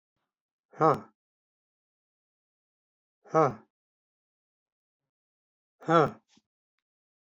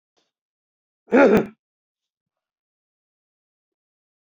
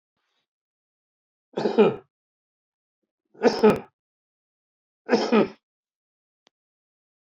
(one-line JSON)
{"exhalation_length": "7.3 s", "exhalation_amplitude": 12400, "exhalation_signal_mean_std_ratio": 0.2, "cough_length": "4.3 s", "cough_amplitude": 19978, "cough_signal_mean_std_ratio": 0.22, "three_cough_length": "7.3 s", "three_cough_amplitude": 17277, "three_cough_signal_mean_std_ratio": 0.27, "survey_phase": "beta (2021-08-13 to 2022-03-07)", "age": "65+", "gender": "Male", "wearing_mask": "No", "symptom_none": true, "smoker_status": "Current smoker (e-cigarettes or vapes only)", "respiratory_condition_asthma": true, "respiratory_condition_other": false, "recruitment_source": "REACT", "submission_delay": "3 days", "covid_test_result": "Negative", "covid_test_method": "RT-qPCR"}